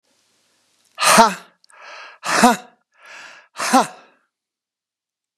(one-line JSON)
{"exhalation_length": "5.4 s", "exhalation_amplitude": 32768, "exhalation_signal_mean_std_ratio": 0.31, "survey_phase": "beta (2021-08-13 to 2022-03-07)", "age": "65+", "gender": "Male", "wearing_mask": "No", "symptom_cough_any": true, "symptom_shortness_of_breath": true, "symptom_fatigue": true, "symptom_headache": true, "symptom_onset": "8 days", "smoker_status": "Never smoked", "respiratory_condition_asthma": false, "respiratory_condition_other": false, "recruitment_source": "REACT", "submission_delay": "1 day", "covid_test_result": "Negative", "covid_test_method": "RT-qPCR"}